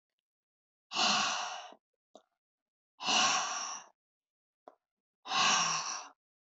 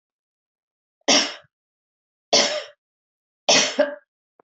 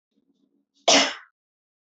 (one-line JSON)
{"exhalation_length": "6.5 s", "exhalation_amplitude": 5401, "exhalation_signal_mean_std_ratio": 0.46, "three_cough_length": "4.4 s", "three_cough_amplitude": 22749, "three_cough_signal_mean_std_ratio": 0.34, "cough_length": "2.0 s", "cough_amplitude": 19006, "cough_signal_mean_std_ratio": 0.27, "survey_phase": "alpha (2021-03-01 to 2021-08-12)", "age": "65+", "gender": "Female", "wearing_mask": "No", "symptom_none": true, "symptom_onset": "4 days", "smoker_status": "Never smoked", "respiratory_condition_asthma": false, "respiratory_condition_other": false, "recruitment_source": "REACT", "submission_delay": "3 days", "covid_test_result": "Negative", "covid_test_method": "RT-qPCR"}